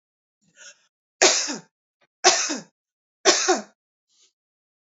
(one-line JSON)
{"three_cough_length": "4.9 s", "three_cough_amplitude": 29008, "three_cough_signal_mean_std_ratio": 0.33, "survey_phase": "beta (2021-08-13 to 2022-03-07)", "age": "45-64", "gender": "Female", "wearing_mask": "Yes", "symptom_none": true, "smoker_status": "Never smoked", "respiratory_condition_asthma": false, "respiratory_condition_other": false, "recruitment_source": "REACT", "submission_delay": "2 days", "covid_test_result": "Negative", "covid_test_method": "RT-qPCR", "influenza_a_test_result": "Negative", "influenza_b_test_result": "Negative"}